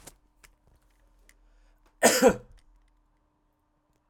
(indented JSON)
{
  "cough_length": "4.1 s",
  "cough_amplitude": 17309,
  "cough_signal_mean_std_ratio": 0.22,
  "survey_phase": "alpha (2021-03-01 to 2021-08-12)",
  "age": "45-64",
  "gender": "Male",
  "wearing_mask": "No",
  "symptom_none": true,
  "smoker_status": "Never smoked",
  "respiratory_condition_asthma": false,
  "respiratory_condition_other": false,
  "recruitment_source": "REACT",
  "submission_delay": "2 days",
  "covid_test_result": "Negative",
  "covid_test_method": "RT-qPCR"
}